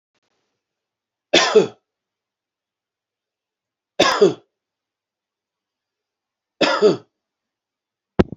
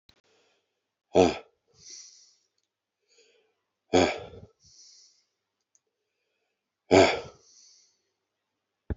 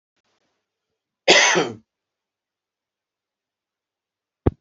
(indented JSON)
{
  "three_cough_length": "8.4 s",
  "three_cough_amplitude": 32767,
  "three_cough_signal_mean_std_ratio": 0.26,
  "exhalation_length": "9.0 s",
  "exhalation_amplitude": 18015,
  "exhalation_signal_mean_std_ratio": 0.21,
  "cough_length": "4.6 s",
  "cough_amplitude": 32235,
  "cough_signal_mean_std_ratio": 0.24,
  "survey_phase": "beta (2021-08-13 to 2022-03-07)",
  "age": "45-64",
  "gender": "Male",
  "wearing_mask": "No",
  "symptom_cough_any": true,
  "symptom_runny_or_blocked_nose": true,
  "symptom_headache": true,
  "symptom_onset": "5 days",
  "smoker_status": "Ex-smoker",
  "respiratory_condition_asthma": false,
  "respiratory_condition_other": false,
  "recruitment_source": "Test and Trace",
  "submission_delay": "2 days",
  "covid_test_result": "Positive",
  "covid_test_method": "RT-qPCR",
  "covid_ct_value": 12.8,
  "covid_ct_gene": "S gene",
  "covid_ct_mean": 13.6,
  "covid_viral_load": "36000000 copies/ml",
  "covid_viral_load_category": "High viral load (>1M copies/ml)"
}